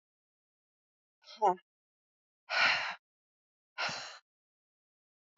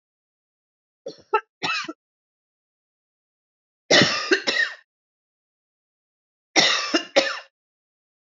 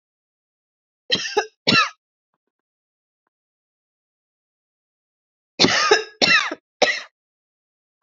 {
  "exhalation_length": "5.4 s",
  "exhalation_amplitude": 5446,
  "exhalation_signal_mean_std_ratio": 0.29,
  "three_cough_length": "8.4 s",
  "three_cough_amplitude": 28443,
  "three_cough_signal_mean_std_ratio": 0.32,
  "cough_length": "8.0 s",
  "cough_amplitude": 31702,
  "cough_signal_mean_std_ratio": 0.31,
  "survey_phase": "beta (2021-08-13 to 2022-03-07)",
  "age": "45-64",
  "gender": "Female",
  "wearing_mask": "No",
  "symptom_none": true,
  "symptom_onset": "8 days",
  "smoker_status": "Ex-smoker",
  "respiratory_condition_asthma": false,
  "respiratory_condition_other": false,
  "recruitment_source": "REACT",
  "submission_delay": "0 days",
  "covid_test_result": "Negative",
  "covid_test_method": "RT-qPCR",
  "influenza_a_test_result": "Negative",
  "influenza_b_test_result": "Negative"
}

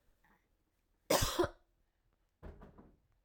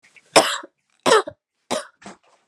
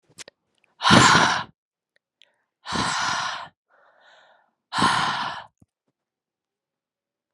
{
  "cough_length": "3.2 s",
  "cough_amplitude": 5252,
  "cough_signal_mean_std_ratio": 0.28,
  "three_cough_length": "2.5 s",
  "three_cough_amplitude": 32767,
  "three_cough_signal_mean_std_ratio": 0.32,
  "exhalation_length": "7.3 s",
  "exhalation_amplitude": 28945,
  "exhalation_signal_mean_std_ratio": 0.37,
  "survey_phase": "alpha (2021-03-01 to 2021-08-12)",
  "age": "18-44",
  "gender": "Female",
  "wearing_mask": "No",
  "symptom_cough_any": true,
  "smoker_status": "Never smoked",
  "respiratory_condition_asthma": false,
  "respiratory_condition_other": true,
  "recruitment_source": "REACT",
  "submission_delay": "1 day",
  "covid_test_result": "Negative",
  "covid_test_method": "RT-qPCR"
}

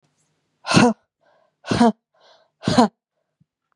{
  "exhalation_length": "3.8 s",
  "exhalation_amplitude": 31008,
  "exhalation_signal_mean_std_ratio": 0.33,
  "survey_phase": "beta (2021-08-13 to 2022-03-07)",
  "age": "18-44",
  "gender": "Female",
  "wearing_mask": "No",
  "symptom_cough_any": true,
  "symptom_new_continuous_cough": true,
  "symptom_runny_or_blocked_nose": true,
  "symptom_sore_throat": true,
  "symptom_fatigue": true,
  "symptom_headache": true,
  "symptom_other": true,
  "symptom_onset": "3 days",
  "smoker_status": "Never smoked",
  "respiratory_condition_asthma": false,
  "respiratory_condition_other": false,
  "recruitment_source": "Test and Trace",
  "submission_delay": "2 days",
  "covid_test_result": "Positive",
  "covid_test_method": "RT-qPCR",
  "covid_ct_value": 14.7,
  "covid_ct_gene": "ORF1ab gene"
}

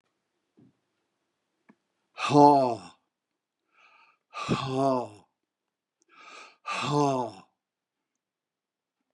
{
  "exhalation_length": "9.1 s",
  "exhalation_amplitude": 17303,
  "exhalation_signal_mean_std_ratio": 0.3,
  "survey_phase": "beta (2021-08-13 to 2022-03-07)",
  "age": "45-64",
  "gender": "Male",
  "wearing_mask": "No",
  "symptom_none": true,
  "smoker_status": "Never smoked",
  "respiratory_condition_asthma": false,
  "respiratory_condition_other": false,
  "recruitment_source": "REACT",
  "submission_delay": "1 day",
  "covid_test_result": "Negative",
  "covid_test_method": "RT-qPCR",
  "influenza_a_test_result": "Negative",
  "influenza_b_test_result": "Negative"
}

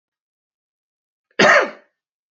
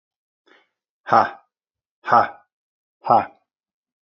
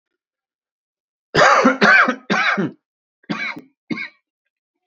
{
  "cough_length": "2.3 s",
  "cough_amplitude": 27425,
  "cough_signal_mean_std_ratio": 0.28,
  "exhalation_length": "4.0 s",
  "exhalation_amplitude": 27329,
  "exhalation_signal_mean_std_ratio": 0.27,
  "three_cough_length": "4.9 s",
  "three_cough_amplitude": 32434,
  "three_cough_signal_mean_std_ratio": 0.42,
  "survey_phase": "beta (2021-08-13 to 2022-03-07)",
  "age": "45-64",
  "gender": "Male",
  "wearing_mask": "No",
  "symptom_cough_any": true,
  "symptom_new_continuous_cough": true,
  "symptom_runny_or_blocked_nose": true,
  "symptom_fatigue": true,
  "smoker_status": "Never smoked",
  "respiratory_condition_asthma": false,
  "respiratory_condition_other": false,
  "recruitment_source": "Test and Trace",
  "submission_delay": "1 day",
  "covid_test_result": "Positive",
  "covid_test_method": "RT-qPCR",
  "covid_ct_value": 22.6,
  "covid_ct_gene": "ORF1ab gene",
  "covid_ct_mean": 23.1,
  "covid_viral_load": "26000 copies/ml",
  "covid_viral_load_category": "Low viral load (10K-1M copies/ml)"
}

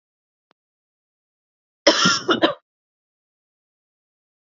{
  "cough_length": "4.4 s",
  "cough_amplitude": 28957,
  "cough_signal_mean_std_ratio": 0.26,
  "survey_phase": "beta (2021-08-13 to 2022-03-07)",
  "age": "45-64",
  "gender": "Female",
  "wearing_mask": "No",
  "symptom_runny_or_blocked_nose": true,
  "symptom_sore_throat": true,
  "symptom_fatigue": true,
  "symptom_onset": "2 days",
  "smoker_status": "Ex-smoker",
  "respiratory_condition_asthma": false,
  "respiratory_condition_other": false,
  "recruitment_source": "Test and Trace",
  "submission_delay": "1 day",
  "covid_test_result": "Positive",
  "covid_test_method": "RT-qPCR",
  "covid_ct_value": 22.1,
  "covid_ct_gene": "ORF1ab gene",
  "covid_ct_mean": 22.6,
  "covid_viral_load": "40000 copies/ml",
  "covid_viral_load_category": "Low viral load (10K-1M copies/ml)"
}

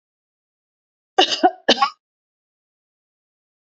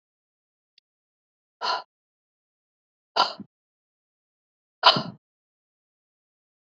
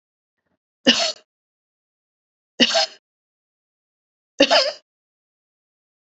{
  "cough_length": "3.7 s",
  "cough_amplitude": 30890,
  "cough_signal_mean_std_ratio": 0.24,
  "exhalation_length": "6.7 s",
  "exhalation_amplitude": 25738,
  "exhalation_signal_mean_std_ratio": 0.18,
  "three_cough_length": "6.1 s",
  "three_cough_amplitude": 28739,
  "three_cough_signal_mean_std_ratio": 0.26,
  "survey_phase": "beta (2021-08-13 to 2022-03-07)",
  "age": "65+",
  "gender": "Female",
  "wearing_mask": "No",
  "symptom_none": true,
  "smoker_status": "Never smoked",
  "respiratory_condition_asthma": false,
  "respiratory_condition_other": false,
  "recruitment_source": "REACT",
  "submission_delay": "4 days",
  "covid_test_result": "Negative",
  "covid_test_method": "RT-qPCR",
  "influenza_a_test_result": "Negative",
  "influenza_b_test_result": "Negative"
}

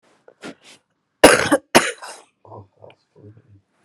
{
  "cough_length": "3.8 s",
  "cough_amplitude": 32768,
  "cough_signal_mean_std_ratio": 0.26,
  "survey_phase": "beta (2021-08-13 to 2022-03-07)",
  "age": "18-44",
  "gender": "Female",
  "wearing_mask": "No",
  "symptom_cough_any": true,
  "symptom_new_continuous_cough": true,
  "symptom_runny_or_blocked_nose": true,
  "symptom_shortness_of_breath": true,
  "symptom_sore_throat": true,
  "symptom_fatigue": true,
  "symptom_onset": "5 days",
  "smoker_status": "Ex-smoker",
  "respiratory_condition_asthma": false,
  "respiratory_condition_other": false,
  "recruitment_source": "REACT",
  "submission_delay": "2 days",
  "covid_test_result": "Negative",
  "covid_test_method": "RT-qPCR",
  "influenza_a_test_result": "Negative",
  "influenza_b_test_result": "Negative"
}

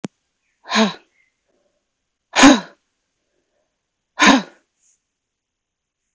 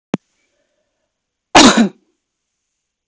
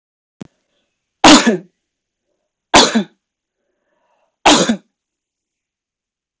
{
  "exhalation_length": "6.1 s",
  "exhalation_amplitude": 30277,
  "exhalation_signal_mean_std_ratio": 0.25,
  "cough_length": "3.1 s",
  "cough_amplitude": 32768,
  "cough_signal_mean_std_ratio": 0.27,
  "three_cough_length": "6.4 s",
  "three_cough_amplitude": 32768,
  "three_cough_signal_mean_std_ratio": 0.29,
  "survey_phase": "alpha (2021-03-01 to 2021-08-12)",
  "age": "45-64",
  "gender": "Female",
  "wearing_mask": "No",
  "symptom_none": true,
  "smoker_status": "Never smoked",
  "respiratory_condition_asthma": false,
  "respiratory_condition_other": false,
  "recruitment_source": "REACT",
  "submission_delay": "2 days",
  "covid_test_result": "Negative",
  "covid_test_method": "RT-qPCR"
}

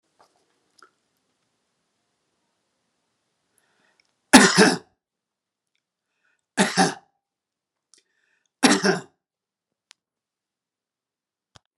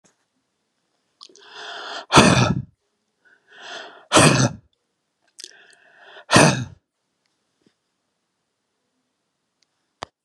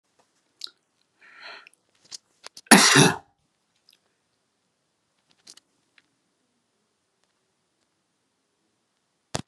{
  "three_cough_length": "11.8 s",
  "three_cough_amplitude": 32768,
  "three_cough_signal_mean_std_ratio": 0.21,
  "exhalation_length": "10.2 s",
  "exhalation_amplitude": 32768,
  "exhalation_signal_mean_std_ratio": 0.28,
  "cough_length": "9.5 s",
  "cough_amplitude": 32767,
  "cough_signal_mean_std_ratio": 0.17,
  "survey_phase": "beta (2021-08-13 to 2022-03-07)",
  "age": "65+",
  "gender": "Male",
  "wearing_mask": "No",
  "symptom_runny_or_blocked_nose": true,
  "symptom_other": true,
  "symptom_onset": "12 days",
  "smoker_status": "Ex-smoker",
  "respiratory_condition_asthma": false,
  "respiratory_condition_other": false,
  "recruitment_source": "REACT",
  "submission_delay": "2 days",
  "covid_test_result": "Negative",
  "covid_test_method": "RT-qPCR"
}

